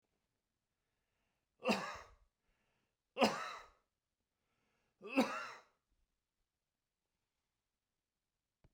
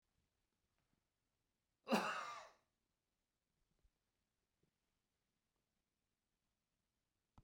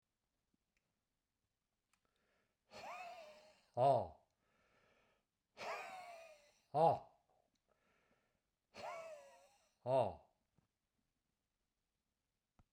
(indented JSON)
{
  "three_cough_length": "8.7 s",
  "three_cough_amplitude": 4905,
  "three_cough_signal_mean_std_ratio": 0.24,
  "cough_length": "7.4 s",
  "cough_amplitude": 2288,
  "cough_signal_mean_std_ratio": 0.19,
  "exhalation_length": "12.7 s",
  "exhalation_amplitude": 2570,
  "exhalation_signal_mean_std_ratio": 0.26,
  "survey_phase": "beta (2021-08-13 to 2022-03-07)",
  "age": "65+",
  "gender": "Male",
  "wearing_mask": "No",
  "symptom_none": true,
  "smoker_status": "Never smoked",
  "respiratory_condition_asthma": false,
  "respiratory_condition_other": false,
  "recruitment_source": "REACT",
  "submission_delay": "1 day",
  "covid_test_result": "Negative",
  "covid_test_method": "RT-qPCR"
}